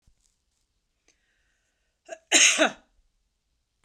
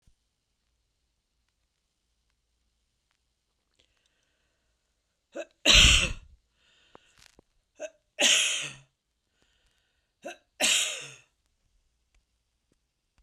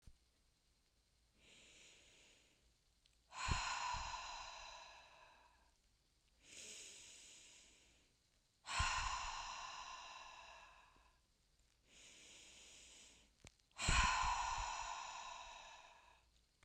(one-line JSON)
{"cough_length": "3.8 s", "cough_amplitude": 19928, "cough_signal_mean_std_ratio": 0.24, "three_cough_length": "13.2 s", "three_cough_amplitude": 20145, "three_cough_signal_mean_std_ratio": 0.24, "exhalation_length": "16.6 s", "exhalation_amplitude": 2513, "exhalation_signal_mean_std_ratio": 0.44, "survey_phase": "beta (2021-08-13 to 2022-03-07)", "age": "65+", "gender": "Female", "wearing_mask": "No", "symptom_none": true, "smoker_status": "Never smoked", "respiratory_condition_asthma": false, "respiratory_condition_other": false, "recruitment_source": "REACT", "submission_delay": "2 days", "covid_test_result": "Negative", "covid_test_method": "RT-qPCR"}